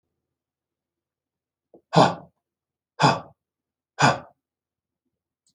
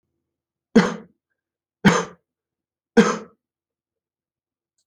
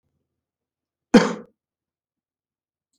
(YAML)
exhalation_length: 5.5 s
exhalation_amplitude: 27286
exhalation_signal_mean_std_ratio: 0.23
three_cough_length: 4.9 s
three_cough_amplitude: 27536
three_cough_signal_mean_std_ratio: 0.24
cough_length: 3.0 s
cough_amplitude: 27643
cough_signal_mean_std_ratio: 0.17
survey_phase: alpha (2021-03-01 to 2021-08-12)
age: 65+
gender: Male
wearing_mask: 'No'
symptom_none: true
smoker_status: Never smoked
respiratory_condition_asthma: false
respiratory_condition_other: false
recruitment_source: REACT
submission_delay: 1 day
covid_test_result: Negative
covid_test_method: RT-qPCR